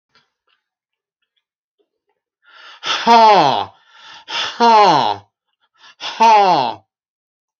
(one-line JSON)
{"exhalation_length": "7.6 s", "exhalation_amplitude": 29288, "exhalation_signal_mean_std_ratio": 0.43, "survey_phase": "beta (2021-08-13 to 2022-03-07)", "age": "65+", "gender": "Male", "wearing_mask": "No", "symptom_none": true, "smoker_status": "Never smoked", "respiratory_condition_asthma": false, "respiratory_condition_other": false, "recruitment_source": "REACT", "submission_delay": "3 days", "covid_test_result": "Negative", "covid_test_method": "RT-qPCR"}